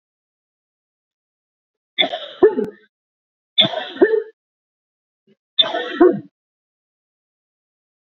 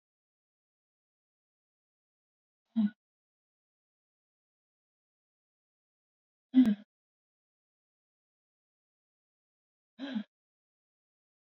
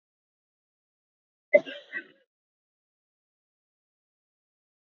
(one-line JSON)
{"three_cough_length": "8.0 s", "three_cough_amplitude": 29050, "three_cough_signal_mean_std_ratio": 0.29, "exhalation_length": "11.4 s", "exhalation_amplitude": 6691, "exhalation_signal_mean_std_ratio": 0.15, "cough_length": "4.9 s", "cough_amplitude": 17620, "cough_signal_mean_std_ratio": 0.11, "survey_phase": "beta (2021-08-13 to 2022-03-07)", "age": "45-64", "gender": "Female", "wearing_mask": "No", "symptom_cough_any": true, "symptom_runny_or_blocked_nose": true, "symptom_fatigue": true, "symptom_headache": true, "symptom_change_to_sense_of_smell_or_taste": true, "smoker_status": "Never smoked", "respiratory_condition_asthma": false, "respiratory_condition_other": false, "recruitment_source": "Test and Trace", "submission_delay": "3 days", "covid_test_result": "Positive", "covid_test_method": "RT-qPCR", "covid_ct_value": 24.9, "covid_ct_gene": "N gene"}